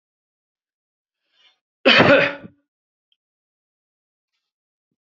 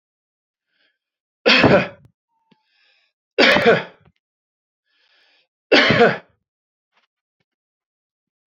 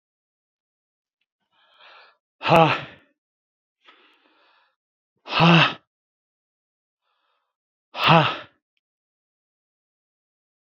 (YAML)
cough_length: 5.0 s
cough_amplitude: 30505
cough_signal_mean_std_ratio: 0.24
three_cough_length: 8.5 s
three_cough_amplitude: 29151
three_cough_signal_mean_std_ratio: 0.3
exhalation_length: 10.8 s
exhalation_amplitude: 27783
exhalation_signal_mean_std_ratio: 0.24
survey_phase: beta (2021-08-13 to 2022-03-07)
age: 45-64
gender: Male
wearing_mask: 'No'
symptom_none: true
smoker_status: Never smoked
respiratory_condition_asthma: false
respiratory_condition_other: false
recruitment_source: REACT
submission_delay: 2 days
covid_test_result: Negative
covid_test_method: RT-qPCR
influenza_a_test_result: Negative
influenza_b_test_result: Negative